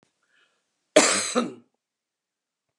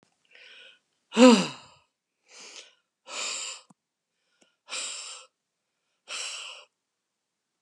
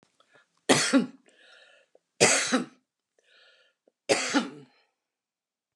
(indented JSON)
{
  "cough_length": "2.8 s",
  "cough_amplitude": 27943,
  "cough_signal_mean_std_ratio": 0.29,
  "exhalation_length": "7.6 s",
  "exhalation_amplitude": 21273,
  "exhalation_signal_mean_std_ratio": 0.22,
  "three_cough_length": "5.8 s",
  "three_cough_amplitude": 19835,
  "three_cough_signal_mean_std_ratio": 0.34,
  "survey_phase": "alpha (2021-03-01 to 2021-08-12)",
  "age": "65+",
  "gender": "Female",
  "wearing_mask": "No",
  "symptom_none": true,
  "smoker_status": "Ex-smoker",
  "respiratory_condition_asthma": false,
  "respiratory_condition_other": false,
  "recruitment_source": "REACT",
  "submission_delay": "3 days",
  "covid_test_result": "Negative",
  "covid_test_method": "RT-qPCR"
}